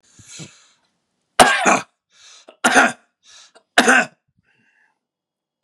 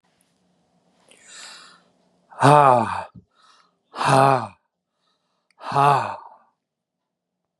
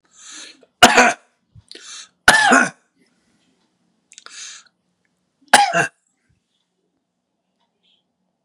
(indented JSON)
{
  "three_cough_length": "5.6 s",
  "three_cough_amplitude": 32768,
  "three_cough_signal_mean_std_ratio": 0.32,
  "exhalation_length": "7.6 s",
  "exhalation_amplitude": 31512,
  "exhalation_signal_mean_std_ratio": 0.32,
  "cough_length": "8.4 s",
  "cough_amplitude": 32768,
  "cough_signal_mean_std_ratio": 0.27,
  "survey_phase": "beta (2021-08-13 to 2022-03-07)",
  "age": "65+",
  "gender": "Male",
  "wearing_mask": "No",
  "symptom_none": true,
  "smoker_status": "Never smoked",
  "respiratory_condition_asthma": false,
  "respiratory_condition_other": false,
  "recruitment_source": "REACT",
  "submission_delay": "2 days",
  "covid_test_result": "Negative",
  "covid_test_method": "RT-qPCR",
  "influenza_a_test_result": "Negative",
  "influenza_b_test_result": "Negative"
}